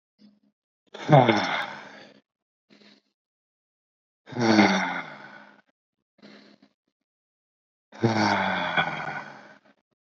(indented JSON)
{
  "exhalation_length": "10.1 s",
  "exhalation_amplitude": 26000,
  "exhalation_signal_mean_std_ratio": 0.36,
  "survey_phase": "beta (2021-08-13 to 2022-03-07)",
  "age": "18-44",
  "gender": "Male",
  "wearing_mask": "No",
  "symptom_none": true,
  "smoker_status": "Never smoked",
  "respiratory_condition_asthma": false,
  "respiratory_condition_other": false,
  "recruitment_source": "REACT",
  "submission_delay": "1 day",
  "covid_test_result": "Negative",
  "covid_test_method": "RT-qPCR"
}